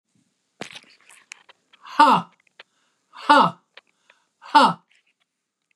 {"exhalation_length": "5.8 s", "exhalation_amplitude": 29323, "exhalation_signal_mean_std_ratio": 0.27, "survey_phase": "beta (2021-08-13 to 2022-03-07)", "age": "65+", "gender": "Female", "wearing_mask": "No", "symptom_change_to_sense_of_smell_or_taste": true, "smoker_status": "Never smoked", "respiratory_condition_asthma": true, "respiratory_condition_other": false, "recruitment_source": "REACT", "submission_delay": "1 day", "covid_test_result": "Negative", "covid_test_method": "RT-qPCR", "influenza_a_test_result": "Negative", "influenza_b_test_result": "Negative"}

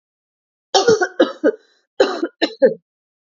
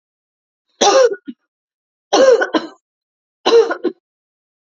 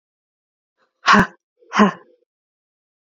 {"cough_length": "3.3 s", "cough_amplitude": 29114, "cough_signal_mean_std_ratio": 0.4, "three_cough_length": "4.6 s", "three_cough_amplitude": 32767, "three_cough_signal_mean_std_ratio": 0.4, "exhalation_length": "3.1 s", "exhalation_amplitude": 28939, "exhalation_signal_mean_std_ratio": 0.27, "survey_phase": "alpha (2021-03-01 to 2021-08-12)", "age": "45-64", "gender": "Female", "wearing_mask": "No", "symptom_cough_any": true, "symptom_fatigue": true, "symptom_fever_high_temperature": true, "symptom_headache": true, "symptom_onset": "4 days", "smoker_status": "Never smoked", "respiratory_condition_asthma": true, "respiratory_condition_other": false, "recruitment_source": "Test and Trace", "submission_delay": "1 day", "covid_test_result": "Positive", "covid_test_method": "RT-qPCR", "covid_ct_value": 17.4, "covid_ct_gene": "ORF1ab gene", "covid_ct_mean": 17.9, "covid_viral_load": "1400000 copies/ml", "covid_viral_load_category": "High viral load (>1M copies/ml)"}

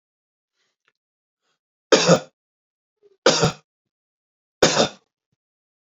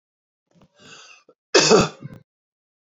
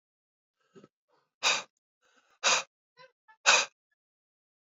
{"three_cough_length": "6.0 s", "three_cough_amplitude": 28435, "three_cough_signal_mean_std_ratio": 0.26, "cough_length": "2.8 s", "cough_amplitude": 29375, "cough_signal_mean_std_ratio": 0.29, "exhalation_length": "4.7 s", "exhalation_amplitude": 15946, "exhalation_signal_mean_std_ratio": 0.26, "survey_phase": "alpha (2021-03-01 to 2021-08-12)", "age": "18-44", "gender": "Male", "wearing_mask": "No", "symptom_fatigue": true, "symptom_fever_high_temperature": true, "symptom_headache": true, "smoker_status": "Ex-smoker", "respiratory_condition_asthma": true, "respiratory_condition_other": false, "recruitment_source": "Test and Trace", "submission_delay": "2 days", "covid_test_result": "Positive", "covid_test_method": "RT-qPCR", "covid_ct_value": 13.6, "covid_ct_gene": "N gene", "covid_ct_mean": 13.9, "covid_viral_load": "27000000 copies/ml", "covid_viral_load_category": "High viral load (>1M copies/ml)"}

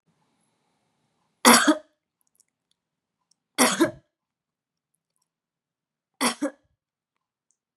{"three_cough_length": "7.8 s", "three_cough_amplitude": 29259, "three_cough_signal_mean_std_ratio": 0.23, "survey_phase": "beta (2021-08-13 to 2022-03-07)", "age": "18-44", "gender": "Female", "wearing_mask": "No", "symptom_cough_any": true, "symptom_runny_or_blocked_nose": true, "symptom_sore_throat": true, "symptom_headache": true, "smoker_status": "Never smoked", "respiratory_condition_asthma": false, "respiratory_condition_other": false, "recruitment_source": "Test and Trace", "submission_delay": "2 days", "covid_test_result": "Positive", "covid_test_method": "RT-qPCR", "covid_ct_value": 19.1, "covid_ct_gene": "ORF1ab gene"}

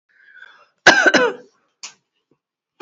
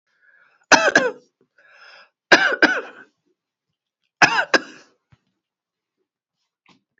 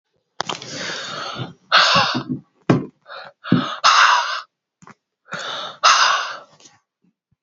{"cough_length": "2.8 s", "cough_amplitude": 32768, "cough_signal_mean_std_ratio": 0.32, "three_cough_length": "7.0 s", "three_cough_amplitude": 30288, "three_cough_signal_mean_std_ratio": 0.28, "exhalation_length": "7.4 s", "exhalation_amplitude": 31030, "exhalation_signal_mean_std_ratio": 0.48, "survey_phase": "beta (2021-08-13 to 2022-03-07)", "age": "45-64", "gender": "Female", "wearing_mask": "No", "symptom_cough_any": true, "symptom_new_continuous_cough": true, "symptom_runny_or_blocked_nose": true, "symptom_onset": "6 days", "smoker_status": "Ex-smoker", "respiratory_condition_asthma": true, "respiratory_condition_other": false, "recruitment_source": "Test and Trace", "submission_delay": "2 days", "covid_test_result": "Positive", "covid_test_method": "RT-qPCR", "covid_ct_value": 20.2, "covid_ct_gene": "ORF1ab gene", "covid_ct_mean": 20.9, "covid_viral_load": "140000 copies/ml", "covid_viral_load_category": "Low viral load (10K-1M copies/ml)"}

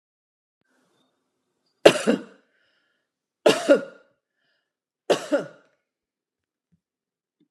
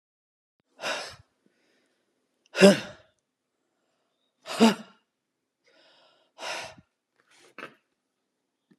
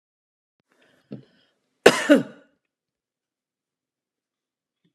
{"three_cough_length": "7.5 s", "three_cough_amplitude": 32768, "three_cough_signal_mean_std_ratio": 0.22, "exhalation_length": "8.8 s", "exhalation_amplitude": 27321, "exhalation_signal_mean_std_ratio": 0.19, "cough_length": "4.9 s", "cough_amplitude": 32768, "cough_signal_mean_std_ratio": 0.17, "survey_phase": "beta (2021-08-13 to 2022-03-07)", "age": "45-64", "gender": "Female", "wearing_mask": "No", "symptom_none": true, "smoker_status": "Ex-smoker", "respiratory_condition_asthma": false, "respiratory_condition_other": false, "recruitment_source": "REACT", "submission_delay": "1 day", "covid_test_result": "Negative", "covid_test_method": "RT-qPCR"}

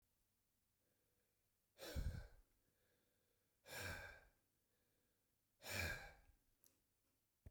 {"exhalation_length": "7.5 s", "exhalation_amplitude": 687, "exhalation_signal_mean_std_ratio": 0.36, "survey_phase": "beta (2021-08-13 to 2022-03-07)", "age": "45-64", "gender": "Male", "wearing_mask": "No", "symptom_none": true, "smoker_status": "Never smoked", "respiratory_condition_asthma": false, "respiratory_condition_other": false, "recruitment_source": "REACT", "submission_delay": "1 day", "covid_test_result": "Negative", "covid_test_method": "RT-qPCR"}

